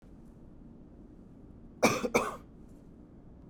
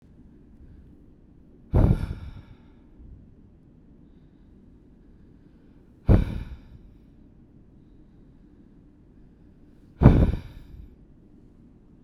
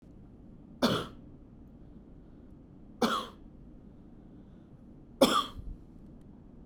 {"cough_length": "3.5 s", "cough_amplitude": 11642, "cough_signal_mean_std_ratio": 0.37, "exhalation_length": "12.0 s", "exhalation_amplitude": 32768, "exhalation_signal_mean_std_ratio": 0.26, "three_cough_length": "6.7 s", "three_cough_amplitude": 14130, "three_cough_signal_mean_std_ratio": 0.37, "survey_phase": "beta (2021-08-13 to 2022-03-07)", "age": "45-64", "gender": "Male", "wearing_mask": "No", "symptom_none": true, "smoker_status": "Never smoked", "respiratory_condition_asthma": false, "respiratory_condition_other": false, "recruitment_source": "REACT", "submission_delay": "2 days", "covid_test_result": "Negative", "covid_test_method": "RT-qPCR", "influenza_a_test_result": "Negative", "influenza_b_test_result": "Negative"}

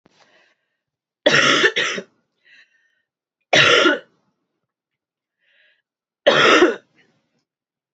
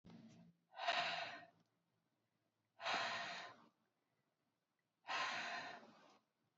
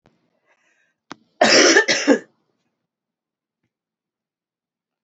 {"three_cough_length": "7.9 s", "three_cough_amplitude": 32768, "three_cough_signal_mean_std_ratio": 0.36, "exhalation_length": "6.6 s", "exhalation_amplitude": 1430, "exhalation_signal_mean_std_ratio": 0.47, "cough_length": "5.0 s", "cough_amplitude": 30900, "cough_signal_mean_std_ratio": 0.29, "survey_phase": "beta (2021-08-13 to 2022-03-07)", "age": "18-44", "gender": "Female", "wearing_mask": "No", "symptom_cough_any": true, "symptom_sore_throat": true, "symptom_other": true, "symptom_onset": "6 days", "smoker_status": "Never smoked", "respiratory_condition_asthma": false, "respiratory_condition_other": false, "recruitment_source": "Test and Trace", "submission_delay": "1 day", "covid_test_result": "Positive", "covid_test_method": "ePCR"}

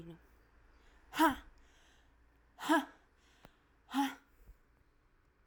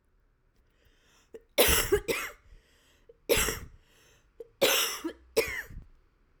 {"exhalation_length": "5.5 s", "exhalation_amplitude": 4746, "exhalation_signal_mean_std_ratio": 0.28, "three_cough_length": "6.4 s", "three_cough_amplitude": 13376, "three_cough_signal_mean_std_ratio": 0.4, "survey_phase": "alpha (2021-03-01 to 2021-08-12)", "age": "18-44", "gender": "Female", "wearing_mask": "No", "symptom_change_to_sense_of_smell_or_taste": true, "symptom_loss_of_taste": true, "symptom_onset": "9 days", "smoker_status": "Current smoker (11 or more cigarettes per day)", "respiratory_condition_asthma": false, "respiratory_condition_other": false, "recruitment_source": "Test and Trace", "submission_delay": "2 days", "covid_test_result": "Positive", "covid_test_method": "RT-qPCR", "covid_ct_value": 22.4, "covid_ct_gene": "ORF1ab gene", "covid_ct_mean": 23.8, "covid_viral_load": "15000 copies/ml", "covid_viral_load_category": "Low viral load (10K-1M copies/ml)"}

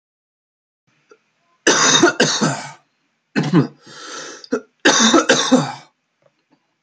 {"cough_length": "6.8 s", "cough_amplitude": 32768, "cough_signal_mean_std_ratio": 0.45, "survey_phase": "alpha (2021-03-01 to 2021-08-12)", "age": "18-44", "gender": "Male", "wearing_mask": "No", "symptom_cough_any": true, "symptom_onset": "2 days", "smoker_status": "Never smoked", "respiratory_condition_asthma": true, "respiratory_condition_other": false, "recruitment_source": "Test and Trace", "submission_delay": "1 day", "covid_test_result": "Positive", "covid_test_method": "RT-qPCR"}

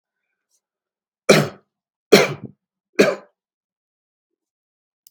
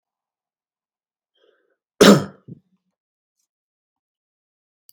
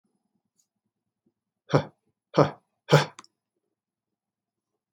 {"three_cough_length": "5.1 s", "three_cough_amplitude": 32768, "three_cough_signal_mean_std_ratio": 0.23, "cough_length": "4.9 s", "cough_amplitude": 32768, "cough_signal_mean_std_ratio": 0.16, "exhalation_length": "4.9 s", "exhalation_amplitude": 24664, "exhalation_signal_mean_std_ratio": 0.19, "survey_phase": "beta (2021-08-13 to 2022-03-07)", "age": "18-44", "gender": "Male", "wearing_mask": "No", "symptom_none": true, "smoker_status": "Ex-smoker", "respiratory_condition_asthma": true, "respiratory_condition_other": false, "recruitment_source": "REACT", "submission_delay": "2 days", "covid_test_result": "Negative", "covid_test_method": "RT-qPCR", "influenza_a_test_result": "Negative", "influenza_b_test_result": "Negative"}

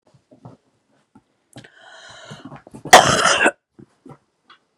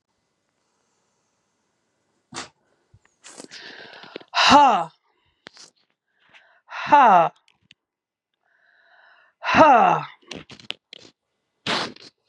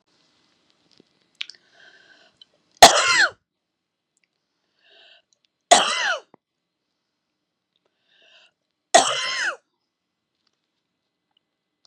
{"cough_length": "4.8 s", "cough_amplitude": 32768, "cough_signal_mean_std_ratio": 0.26, "exhalation_length": "12.3 s", "exhalation_amplitude": 30112, "exhalation_signal_mean_std_ratio": 0.3, "three_cough_length": "11.9 s", "three_cough_amplitude": 32768, "three_cough_signal_mean_std_ratio": 0.22, "survey_phase": "beta (2021-08-13 to 2022-03-07)", "age": "45-64", "gender": "Female", "wearing_mask": "No", "symptom_cough_any": true, "symptom_runny_or_blocked_nose": true, "symptom_shortness_of_breath": true, "symptom_sore_throat": true, "symptom_fatigue": true, "symptom_onset": "3 days", "smoker_status": "Never smoked", "respiratory_condition_asthma": false, "respiratory_condition_other": false, "recruitment_source": "Test and Trace", "submission_delay": "1 day", "covid_test_result": "Negative", "covid_test_method": "ePCR"}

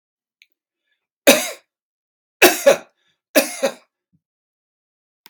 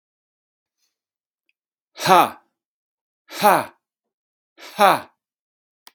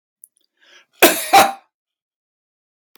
{"three_cough_length": "5.3 s", "three_cough_amplitude": 32768, "three_cough_signal_mean_std_ratio": 0.26, "exhalation_length": "5.9 s", "exhalation_amplitude": 32767, "exhalation_signal_mean_std_ratio": 0.24, "cough_length": "3.0 s", "cough_amplitude": 32768, "cough_signal_mean_std_ratio": 0.28, "survey_phase": "beta (2021-08-13 to 2022-03-07)", "age": "65+", "gender": "Male", "wearing_mask": "No", "symptom_none": true, "smoker_status": "Never smoked", "respiratory_condition_asthma": false, "respiratory_condition_other": true, "recruitment_source": "REACT", "submission_delay": "0 days", "covid_test_result": "Negative", "covid_test_method": "RT-qPCR", "influenza_a_test_result": "Negative", "influenza_b_test_result": "Negative"}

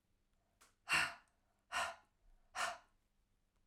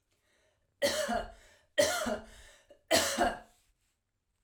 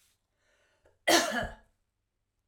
{"exhalation_length": "3.7 s", "exhalation_amplitude": 2390, "exhalation_signal_mean_std_ratio": 0.33, "three_cough_length": "4.4 s", "three_cough_amplitude": 7435, "three_cough_signal_mean_std_ratio": 0.44, "cough_length": "2.5 s", "cough_amplitude": 10021, "cough_signal_mean_std_ratio": 0.3, "survey_phase": "alpha (2021-03-01 to 2021-08-12)", "age": "45-64", "gender": "Female", "wearing_mask": "No", "symptom_none": true, "smoker_status": "Never smoked", "respiratory_condition_asthma": false, "respiratory_condition_other": false, "recruitment_source": "REACT", "submission_delay": "1 day", "covid_test_result": "Negative", "covid_test_method": "RT-qPCR"}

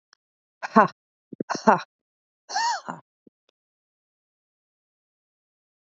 {"exhalation_length": "6.0 s", "exhalation_amplitude": 27666, "exhalation_signal_mean_std_ratio": 0.21, "survey_phase": "beta (2021-08-13 to 2022-03-07)", "age": "45-64", "gender": "Female", "wearing_mask": "No", "symptom_cough_any": true, "symptom_new_continuous_cough": true, "symptom_sore_throat": true, "symptom_abdominal_pain": true, "symptom_headache": true, "symptom_onset": "4 days", "smoker_status": "Never smoked", "respiratory_condition_asthma": false, "respiratory_condition_other": false, "recruitment_source": "Test and Trace", "submission_delay": "1 day", "covid_test_result": "Positive", "covid_test_method": "RT-qPCR"}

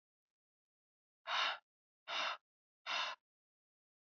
{"exhalation_length": "4.2 s", "exhalation_amplitude": 1988, "exhalation_signal_mean_std_ratio": 0.36, "survey_phase": "beta (2021-08-13 to 2022-03-07)", "age": "18-44", "gender": "Female", "wearing_mask": "No", "symptom_cough_any": true, "symptom_runny_or_blocked_nose": true, "symptom_shortness_of_breath": true, "symptom_fatigue": true, "symptom_headache": true, "symptom_change_to_sense_of_smell_or_taste": true, "symptom_loss_of_taste": true, "symptom_onset": "6 days", "smoker_status": "Ex-smoker", "respiratory_condition_asthma": false, "respiratory_condition_other": false, "recruitment_source": "Test and Trace", "submission_delay": "2 days", "covid_test_result": "Positive", "covid_test_method": "RT-qPCR"}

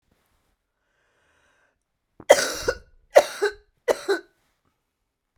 {"three_cough_length": "5.4 s", "three_cough_amplitude": 32768, "three_cough_signal_mean_std_ratio": 0.23, "survey_phase": "beta (2021-08-13 to 2022-03-07)", "age": "45-64", "gender": "Female", "wearing_mask": "No", "symptom_cough_any": true, "symptom_fatigue": true, "symptom_fever_high_temperature": true, "symptom_loss_of_taste": true, "symptom_onset": "6 days", "smoker_status": "Ex-smoker", "respiratory_condition_asthma": false, "respiratory_condition_other": false, "recruitment_source": "Test and Trace", "submission_delay": "2 days", "covid_test_result": "Positive", "covid_test_method": "RT-qPCR", "covid_ct_value": 17.6, "covid_ct_gene": "ORF1ab gene", "covid_ct_mean": 18.2, "covid_viral_load": "1100000 copies/ml", "covid_viral_load_category": "High viral load (>1M copies/ml)"}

